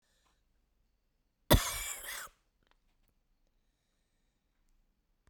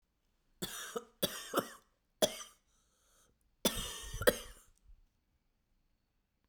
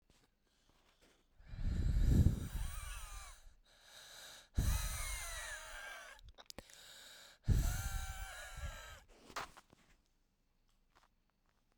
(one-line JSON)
{"cough_length": "5.3 s", "cough_amplitude": 10540, "cough_signal_mean_std_ratio": 0.19, "three_cough_length": "6.5 s", "three_cough_amplitude": 8372, "three_cough_signal_mean_std_ratio": 0.29, "exhalation_length": "11.8 s", "exhalation_amplitude": 5126, "exhalation_signal_mean_std_ratio": 0.45, "survey_phase": "beta (2021-08-13 to 2022-03-07)", "age": "45-64", "gender": "Female", "wearing_mask": "No", "symptom_cough_any": true, "symptom_new_continuous_cough": true, "symptom_runny_or_blocked_nose": true, "symptom_shortness_of_breath": true, "symptom_sore_throat": true, "symptom_fatigue": true, "symptom_fever_high_temperature": true, "symptom_headache": true, "symptom_change_to_sense_of_smell_or_taste": true, "symptom_loss_of_taste": true, "smoker_status": "Never smoked", "respiratory_condition_asthma": true, "respiratory_condition_other": false, "recruitment_source": "Test and Trace", "submission_delay": "1 day", "covid_test_result": "Positive", "covid_test_method": "RT-qPCR", "covid_ct_value": 25.8, "covid_ct_gene": "N gene"}